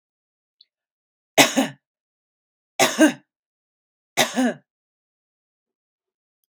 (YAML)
three_cough_length: 6.5 s
three_cough_amplitude: 32767
three_cough_signal_mean_std_ratio: 0.26
survey_phase: beta (2021-08-13 to 2022-03-07)
age: 45-64
gender: Female
wearing_mask: 'No'
symptom_sore_throat: true
symptom_fatigue: true
symptom_headache: true
symptom_other: true
smoker_status: Never smoked
respiratory_condition_asthma: false
respiratory_condition_other: false
recruitment_source: Test and Trace
submission_delay: 1 day
covid_test_result: Positive
covid_test_method: ePCR